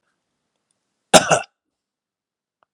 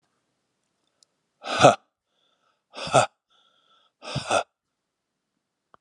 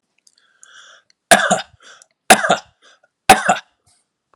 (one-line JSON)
{"cough_length": "2.7 s", "cough_amplitude": 32768, "cough_signal_mean_std_ratio": 0.19, "exhalation_length": "5.8 s", "exhalation_amplitude": 29898, "exhalation_signal_mean_std_ratio": 0.23, "three_cough_length": "4.4 s", "three_cough_amplitude": 32768, "three_cough_signal_mean_std_ratio": 0.29, "survey_phase": "alpha (2021-03-01 to 2021-08-12)", "age": "45-64", "gender": "Male", "wearing_mask": "No", "symptom_none": true, "smoker_status": "Never smoked", "respiratory_condition_asthma": false, "respiratory_condition_other": false, "recruitment_source": "REACT", "submission_delay": "1 day", "covid_test_result": "Negative", "covid_test_method": "RT-qPCR"}